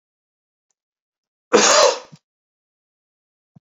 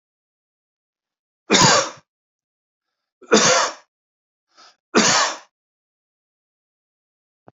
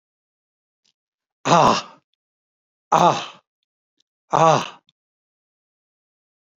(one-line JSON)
{"cough_length": "3.8 s", "cough_amplitude": 28130, "cough_signal_mean_std_ratio": 0.27, "three_cough_length": "7.6 s", "three_cough_amplitude": 29933, "three_cough_signal_mean_std_ratio": 0.31, "exhalation_length": "6.6 s", "exhalation_amplitude": 28151, "exhalation_signal_mean_std_ratio": 0.27, "survey_phase": "beta (2021-08-13 to 2022-03-07)", "age": "65+", "gender": "Male", "wearing_mask": "No", "symptom_headache": true, "smoker_status": "Ex-smoker", "respiratory_condition_asthma": false, "respiratory_condition_other": false, "recruitment_source": "REACT", "submission_delay": "1 day", "covid_test_result": "Negative", "covid_test_method": "RT-qPCR", "influenza_a_test_result": "Negative", "influenza_b_test_result": "Negative"}